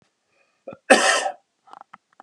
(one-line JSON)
{"cough_length": "2.2 s", "cough_amplitude": 32693, "cough_signal_mean_std_ratio": 0.31, "survey_phase": "beta (2021-08-13 to 2022-03-07)", "age": "45-64", "gender": "Male", "wearing_mask": "No", "symptom_none": true, "smoker_status": "Never smoked", "respiratory_condition_asthma": false, "respiratory_condition_other": false, "recruitment_source": "REACT", "submission_delay": "2 days", "covid_test_result": "Negative", "covid_test_method": "RT-qPCR", "influenza_a_test_result": "Unknown/Void", "influenza_b_test_result": "Unknown/Void"}